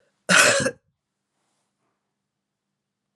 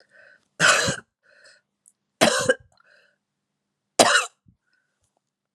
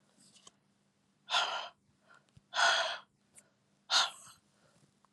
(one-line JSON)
{"cough_length": "3.2 s", "cough_amplitude": 26227, "cough_signal_mean_std_ratio": 0.28, "three_cough_length": "5.5 s", "three_cough_amplitude": 32767, "three_cough_signal_mean_std_ratio": 0.31, "exhalation_length": "5.1 s", "exhalation_amplitude": 5455, "exhalation_signal_mean_std_ratio": 0.35, "survey_phase": "beta (2021-08-13 to 2022-03-07)", "age": "45-64", "gender": "Female", "wearing_mask": "No", "symptom_runny_or_blocked_nose": true, "symptom_sore_throat": true, "symptom_headache": true, "symptom_onset": "3 days", "smoker_status": "Never smoked", "respiratory_condition_asthma": false, "respiratory_condition_other": false, "recruitment_source": "Test and Trace", "submission_delay": "2 days", "covid_test_result": "Positive", "covid_test_method": "ePCR"}